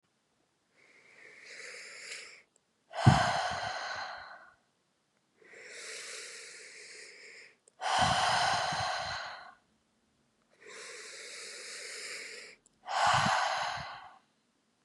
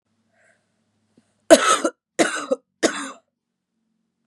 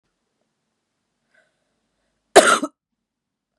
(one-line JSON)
{"exhalation_length": "14.8 s", "exhalation_amplitude": 12117, "exhalation_signal_mean_std_ratio": 0.46, "three_cough_length": "4.3 s", "three_cough_amplitude": 32768, "three_cough_signal_mean_std_ratio": 0.28, "cough_length": "3.6 s", "cough_amplitude": 32768, "cough_signal_mean_std_ratio": 0.19, "survey_phase": "beta (2021-08-13 to 2022-03-07)", "age": "18-44", "gender": "Female", "wearing_mask": "No", "symptom_cough_any": true, "symptom_runny_or_blocked_nose": true, "symptom_shortness_of_breath": true, "symptom_other": true, "smoker_status": "Current smoker (11 or more cigarettes per day)", "respiratory_condition_asthma": true, "respiratory_condition_other": false, "recruitment_source": "Test and Trace", "submission_delay": "2 days", "covid_test_result": "Positive", "covid_test_method": "LFT"}